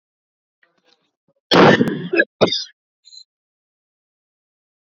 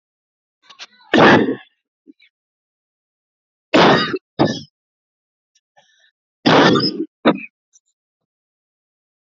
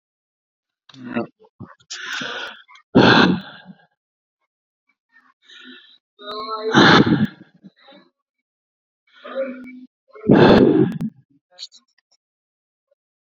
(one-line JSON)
{"cough_length": "4.9 s", "cough_amplitude": 29535, "cough_signal_mean_std_ratio": 0.3, "three_cough_length": "9.3 s", "three_cough_amplitude": 30912, "three_cough_signal_mean_std_ratio": 0.33, "exhalation_length": "13.2 s", "exhalation_amplitude": 28942, "exhalation_signal_mean_std_ratio": 0.34, "survey_phase": "alpha (2021-03-01 to 2021-08-12)", "age": "45-64", "gender": "Male", "wearing_mask": "No", "symptom_none": true, "smoker_status": "Never smoked", "respiratory_condition_asthma": false, "respiratory_condition_other": false, "recruitment_source": "REACT", "submission_delay": "2 days", "covid_test_result": "Negative", "covid_test_method": "RT-qPCR"}